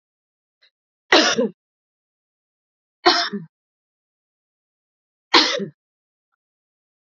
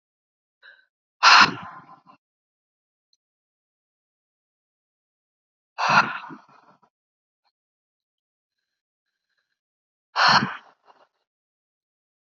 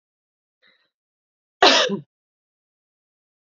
three_cough_length: 7.1 s
three_cough_amplitude: 32768
three_cough_signal_mean_std_ratio: 0.26
exhalation_length: 12.4 s
exhalation_amplitude: 32740
exhalation_signal_mean_std_ratio: 0.21
cough_length: 3.6 s
cough_amplitude: 27501
cough_signal_mean_std_ratio: 0.22
survey_phase: alpha (2021-03-01 to 2021-08-12)
age: 45-64
gender: Female
wearing_mask: 'No'
symptom_none: true
smoker_status: Ex-smoker
respiratory_condition_asthma: true
respiratory_condition_other: false
recruitment_source: REACT
submission_delay: 1 day
covid_test_result: Negative
covid_test_method: RT-qPCR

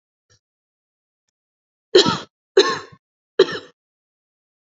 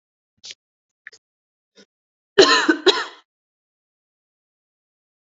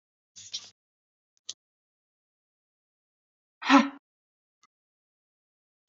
three_cough_length: 4.6 s
three_cough_amplitude: 29700
three_cough_signal_mean_std_ratio: 0.24
cough_length: 5.2 s
cough_amplitude: 32767
cough_signal_mean_std_ratio: 0.23
exhalation_length: 5.9 s
exhalation_amplitude: 16577
exhalation_signal_mean_std_ratio: 0.15
survey_phase: beta (2021-08-13 to 2022-03-07)
age: 18-44
gender: Female
wearing_mask: 'Yes'
symptom_none: true
smoker_status: Never smoked
respiratory_condition_asthma: true
respiratory_condition_other: false
recruitment_source: REACT
submission_delay: 0 days
covid_test_result: Negative
covid_test_method: RT-qPCR
influenza_a_test_result: Negative
influenza_b_test_result: Negative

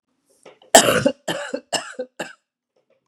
cough_length: 3.1 s
cough_amplitude: 32768
cough_signal_mean_std_ratio: 0.32
survey_phase: beta (2021-08-13 to 2022-03-07)
age: 45-64
gender: Female
wearing_mask: 'No'
symptom_cough_any: true
symptom_new_continuous_cough: true
symptom_runny_or_blocked_nose: true
symptom_fatigue: true
symptom_onset: 3 days
smoker_status: Never smoked
respiratory_condition_asthma: false
respiratory_condition_other: false
recruitment_source: Test and Trace
submission_delay: 1 day
covid_test_result: Negative
covid_test_method: RT-qPCR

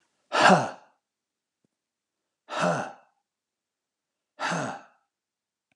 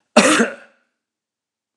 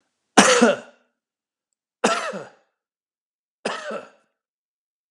exhalation_length: 5.8 s
exhalation_amplitude: 18320
exhalation_signal_mean_std_ratio: 0.29
cough_length: 1.8 s
cough_amplitude: 32768
cough_signal_mean_std_ratio: 0.34
three_cough_length: 5.1 s
three_cough_amplitude: 32768
three_cough_signal_mean_std_ratio: 0.3
survey_phase: alpha (2021-03-01 to 2021-08-12)
age: 65+
gender: Male
wearing_mask: 'No'
symptom_none: true
smoker_status: Never smoked
respiratory_condition_asthma: false
respiratory_condition_other: false
recruitment_source: REACT
submission_delay: 1 day
covid_test_result: Negative
covid_test_method: RT-qPCR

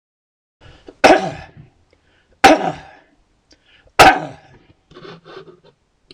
three_cough_length: 6.1 s
three_cough_amplitude: 26028
three_cough_signal_mean_std_ratio: 0.28
survey_phase: beta (2021-08-13 to 2022-03-07)
age: 45-64
gender: Male
wearing_mask: 'No'
symptom_cough_any: true
smoker_status: Ex-smoker
respiratory_condition_asthma: false
respiratory_condition_other: false
recruitment_source: REACT
submission_delay: 14 days
covid_test_result: Negative
covid_test_method: RT-qPCR
influenza_a_test_result: Unknown/Void
influenza_b_test_result: Unknown/Void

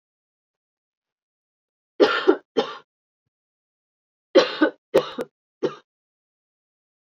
three_cough_length: 7.1 s
three_cough_amplitude: 25477
three_cough_signal_mean_std_ratio: 0.26
survey_phase: beta (2021-08-13 to 2022-03-07)
age: 45-64
gender: Female
wearing_mask: 'Yes'
symptom_cough_any: true
symptom_runny_or_blocked_nose: true
symptom_headache: true
symptom_change_to_sense_of_smell_or_taste: true
symptom_loss_of_taste: true
symptom_onset: 9 days
smoker_status: Current smoker (1 to 10 cigarettes per day)
respiratory_condition_asthma: false
respiratory_condition_other: false
recruitment_source: Test and Trace
submission_delay: 2 days
covid_test_result: Positive
covid_test_method: RT-qPCR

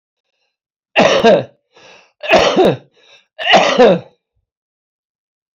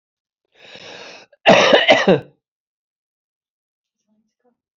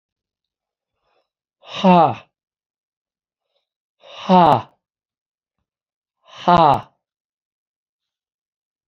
three_cough_length: 5.5 s
three_cough_amplitude: 32767
three_cough_signal_mean_std_ratio: 0.44
cough_length: 4.8 s
cough_amplitude: 29803
cough_signal_mean_std_ratio: 0.31
exhalation_length: 8.9 s
exhalation_amplitude: 32172
exhalation_signal_mean_std_ratio: 0.26
survey_phase: alpha (2021-03-01 to 2021-08-12)
age: 65+
gender: Male
wearing_mask: 'No'
symptom_none: true
smoker_status: Never smoked
respiratory_condition_asthma: true
respiratory_condition_other: false
recruitment_source: REACT
submission_delay: 3 days
covid_test_result: Negative
covid_test_method: RT-qPCR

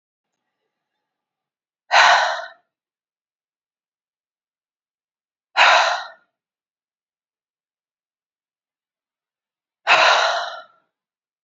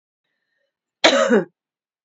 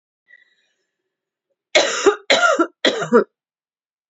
exhalation_length: 11.4 s
exhalation_amplitude: 27857
exhalation_signal_mean_std_ratio: 0.28
cough_length: 2.0 s
cough_amplitude: 27817
cough_signal_mean_std_ratio: 0.34
three_cough_length: 4.1 s
three_cough_amplitude: 30299
three_cough_signal_mean_std_ratio: 0.39
survey_phase: beta (2021-08-13 to 2022-03-07)
age: 45-64
gender: Female
wearing_mask: 'No'
symptom_none: true
smoker_status: Ex-smoker
respiratory_condition_asthma: false
respiratory_condition_other: false
recruitment_source: REACT
submission_delay: 1 day
covid_test_result: Negative
covid_test_method: RT-qPCR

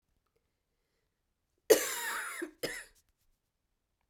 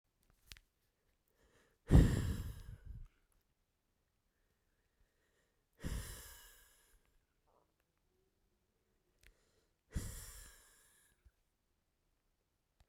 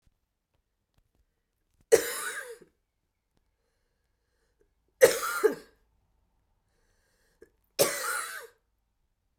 cough_length: 4.1 s
cough_amplitude: 11211
cough_signal_mean_std_ratio: 0.26
exhalation_length: 12.9 s
exhalation_amplitude: 6785
exhalation_signal_mean_std_ratio: 0.19
three_cough_length: 9.4 s
three_cough_amplitude: 19031
three_cough_signal_mean_std_ratio: 0.24
survey_phase: beta (2021-08-13 to 2022-03-07)
age: 45-64
gender: Female
wearing_mask: 'No'
symptom_cough_any: true
symptom_new_continuous_cough: true
symptom_runny_or_blocked_nose: true
symptom_shortness_of_breath: true
symptom_fatigue: true
symptom_headache: true
symptom_change_to_sense_of_smell_or_taste: true
symptom_loss_of_taste: true
symptom_onset: 2 days
smoker_status: Never smoked
respiratory_condition_asthma: false
respiratory_condition_other: false
recruitment_source: Test and Trace
submission_delay: 1 day
covid_test_result: Positive
covid_test_method: RT-qPCR
covid_ct_value: 16.8
covid_ct_gene: ORF1ab gene
covid_ct_mean: 17.8
covid_viral_load: 1400000 copies/ml
covid_viral_load_category: High viral load (>1M copies/ml)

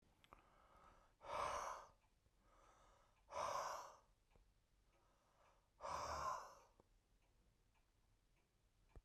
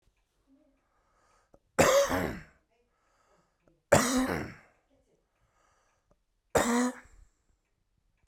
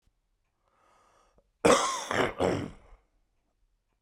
exhalation_length: 9.0 s
exhalation_amplitude: 742
exhalation_signal_mean_std_ratio: 0.43
three_cough_length: 8.3 s
three_cough_amplitude: 14513
three_cough_signal_mean_std_ratio: 0.32
cough_length: 4.0 s
cough_amplitude: 12172
cough_signal_mean_std_ratio: 0.34
survey_phase: beta (2021-08-13 to 2022-03-07)
age: 45-64
gender: Male
wearing_mask: 'No'
symptom_cough_any: true
symptom_sore_throat: true
symptom_fever_high_temperature: true
symptom_headache: true
symptom_onset: 2 days
smoker_status: Ex-smoker
respiratory_condition_asthma: false
respiratory_condition_other: false
recruitment_source: Test and Trace
submission_delay: 1 day
covid_test_result: Positive
covid_test_method: RT-qPCR
covid_ct_value: 25.2
covid_ct_gene: ORF1ab gene
covid_ct_mean: 25.9
covid_viral_load: 3200 copies/ml
covid_viral_load_category: Minimal viral load (< 10K copies/ml)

